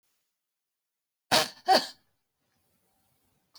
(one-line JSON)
{"cough_length": "3.6 s", "cough_amplitude": 19934, "cough_signal_mean_std_ratio": 0.22, "survey_phase": "beta (2021-08-13 to 2022-03-07)", "age": "65+", "gender": "Female", "wearing_mask": "No", "symptom_none": true, "smoker_status": "Never smoked", "respiratory_condition_asthma": false, "respiratory_condition_other": false, "recruitment_source": "REACT", "submission_delay": "2 days", "covid_test_result": "Negative", "covid_test_method": "RT-qPCR"}